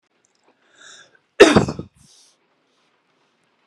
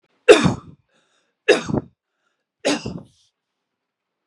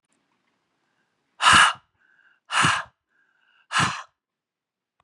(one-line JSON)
{"cough_length": "3.7 s", "cough_amplitude": 32768, "cough_signal_mean_std_ratio": 0.21, "three_cough_length": "4.3 s", "three_cough_amplitude": 32768, "three_cough_signal_mean_std_ratio": 0.27, "exhalation_length": "5.0 s", "exhalation_amplitude": 24365, "exhalation_signal_mean_std_ratio": 0.31, "survey_phase": "beta (2021-08-13 to 2022-03-07)", "age": "45-64", "gender": "Female", "wearing_mask": "No", "symptom_none": true, "smoker_status": "Ex-smoker", "respiratory_condition_asthma": false, "respiratory_condition_other": false, "recruitment_source": "REACT", "submission_delay": "2 days", "covid_test_result": "Negative", "covid_test_method": "RT-qPCR"}